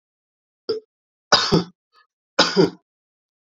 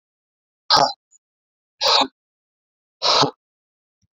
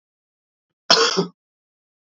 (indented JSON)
{
  "three_cough_length": "3.5 s",
  "three_cough_amplitude": 32767,
  "three_cough_signal_mean_std_ratio": 0.32,
  "exhalation_length": "4.2 s",
  "exhalation_amplitude": 29137,
  "exhalation_signal_mean_std_ratio": 0.33,
  "cough_length": "2.1 s",
  "cough_amplitude": 32074,
  "cough_signal_mean_std_ratio": 0.29,
  "survey_phase": "beta (2021-08-13 to 2022-03-07)",
  "age": "65+",
  "gender": "Male",
  "wearing_mask": "No",
  "symptom_cough_any": true,
  "symptom_runny_or_blocked_nose": true,
  "symptom_fatigue": true,
  "symptom_headache": true,
  "smoker_status": "Never smoked",
  "respiratory_condition_asthma": false,
  "respiratory_condition_other": false,
  "recruitment_source": "Test and Trace",
  "submission_delay": "1 day",
  "covid_test_result": "Positive",
  "covid_test_method": "RT-qPCR",
  "covid_ct_value": 22.3,
  "covid_ct_gene": "ORF1ab gene"
}